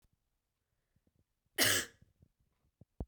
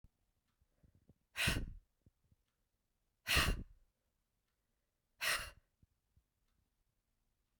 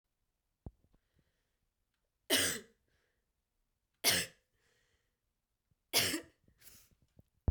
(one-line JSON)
{"cough_length": "3.1 s", "cough_amplitude": 5665, "cough_signal_mean_std_ratio": 0.24, "exhalation_length": "7.6 s", "exhalation_amplitude": 3700, "exhalation_signal_mean_std_ratio": 0.28, "three_cough_length": "7.5 s", "three_cough_amplitude": 5879, "three_cough_signal_mean_std_ratio": 0.26, "survey_phase": "beta (2021-08-13 to 2022-03-07)", "age": "18-44", "gender": "Male", "wearing_mask": "No", "symptom_cough_any": true, "symptom_runny_or_blocked_nose": true, "symptom_sore_throat": true, "symptom_fatigue": true, "smoker_status": "Never smoked", "respiratory_condition_asthma": false, "respiratory_condition_other": false, "recruitment_source": "Test and Trace", "submission_delay": "1 day", "covid_test_result": "Positive", "covid_test_method": "ePCR"}